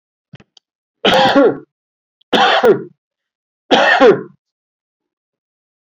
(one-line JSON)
{"three_cough_length": "5.8 s", "three_cough_amplitude": 30292, "three_cough_signal_mean_std_ratio": 0.42, "survey_phase": "beta (2021-08-13 to 2022-03-07)", "age": "65+", "gender": "Male", "wearing_mask": "No", "symptom_none": true, "smoker_status": "Ex-smoker", "respiratory_condition_asthma": false, "respiratory_condition_other": false, "recruitment_source": "REACT", "submission_delay": "3 days", "covid_test_result": "Negative", "covid_test_method": "RT-qPCR", "influenza_a_test_result": "Negative", "influenza_b_test_result": "Negative"}